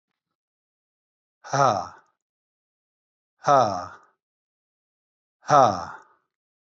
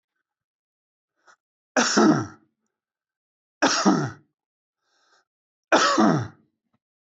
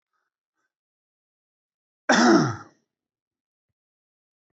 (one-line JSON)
{"exhalation_length": "6.7 s", "exhalation_amplitude": 22509, "exhalation_signal_mean_std_ratio": 0.27, "three_cough_length": "7.2 s", "three_cough_amplitude": 18281, "three_cough_signal_mean_std_ratio": 0.36, "cough_length": "4.5 s", "cough_amplitude": 15864, "cough_signal_mean_std_ratio": 0.25, "survey_phase": "beta (2021-08-13 to 2022-03-07)", "age": "45-64", "gender": "Male", "wearing_mask": "No", "symptom_none": true, "smoker_status": "Never smoked", "respiratory_condition_asthma": false, "respiratory_condition_other": false, "recruitment_source": "REACT", "submission_delay": "1 day", "covid_test_result": "Negative", "covid_test_method": "RT-qPCR", "influenza_a_test_result": "Negative", "influenza_b_test_result": "Negative"}